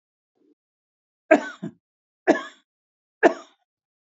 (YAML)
three_cough_length: 4.1 s
three_cough_amplitude: 26522
three_cough_signal_mean_std_ratio: 0.21
survey_phase: beta (2021-08-13 to 2022-03-07)
age: 45-64
gender: Male
wearing_mask: 'No'
symptom_none: true
smoker_status: Ex-smoker
respiratory_condition_asthma: false
respiratory_condition_other: true
recruitment_source: REACT
submission_delay: 1 day
covid_test_result: Negative
covid_test_method: RT-qPCR
influenza_a_test_result: Negative
influenza_b_test_result: Negative